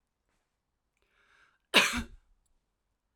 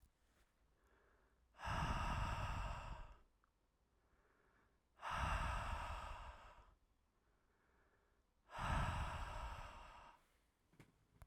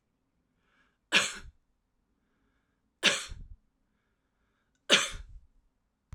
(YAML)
cough_length: 3.2 s
cough_amplitude: 13892
cough_signal_mean_std_ratio: 0.21
exhalation_length: 11.3 s
exhalation_amplitude: 1119
exhalation_signal_mean_std_ratio: 0.53
three_cough_length: 6.1 s
three_cough_amplitude: 17273
three_cough_signal_mean_std_ratio: 0.24
survey_phase: beta (2021-08-13 to 2022-03-07)
age: 45-64
gender: Female
wearing_mask: 'No'
symptom_runny_or_blocked_nose: true
symptom_sore_throat: true
symptom_abdominal_pain: true
symptom_other: true
smoker_status: Ex-smoker
respiratory_condition_asthma: false
respiratory_condition_other: false
recruitment_source: Test and Trace
submission_delay: 1 day
covid_test_result: Positive
covid_test_method: LAMP